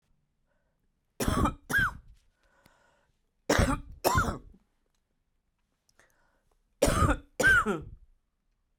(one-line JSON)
{"three_cough_length": "8.8 s", "three_cough_amplitude": 12388, "three_cough_signal_mean_std_ratio": 0.38, "survey_phase": "beta (2021-08-13 to 2022-03-07)", "age": "45-64", "gender": "Female", "wearing_mask": "No", "symptom_cough_any": true, "symptom_runny_or_blocked_nose": true, "symptom_sore_throat": true, "symptom_abdominal_pain": true, "symptom_diarrhoea": true, "symptom_fatigue": true, "symptom_headache": true, "symptom_onset": "3 days", "smoker_status": "Current smoker (e-cigarettes or vapes only)", "respiratory_condition_asthma": false, "respiratory_condition_other": false, "recruitment_source": "Test and Trace", "submission_delay": "2 days", "covid_test_result": "Positive", "covid_test_method": "RT-qPCR", "covid_ct_value": 17.3, "covid_ct_gene": "ORF1ab gene", "covid_ct_mean": 18.4, "covid_viral_load": "920000 copies/ml", "covid_viral_load_category": "Low viral load (10K-1M copies/ml)"}